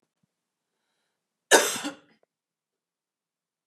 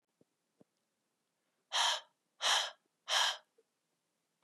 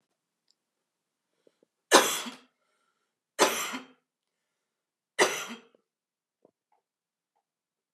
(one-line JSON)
{"cough_length": "3.7 s", "cough_amplitude": 23041, "cough_signal_mean_std_ratio": 0.19, "exhalation_length": "4.4 s", "exhalation_amplitude": 5915, "exhalation_signal_mean_std_ratio": 0.34, "three_cough_length": "7.9 s", "three_cough_amplitude": 24604, "three_cough_signal_mean_std_ratio": 0.22, "survey_phase": "beta (2021-08-13 to 2022-03-07)", "age": "18-44", "gender": "Female", "wearing_mask": "No", "symptom_cough_any": true, "symptom_onset": "2 days", "smoker_status": "Never smoked", "respiratory_condition_asthma": false, "respiratory_condition_other": false, "recruitment_source": "Test and Trace", "submission_delay": "1 day", "covid_test_result": "Negative", "covid_test_method": "ePCR"}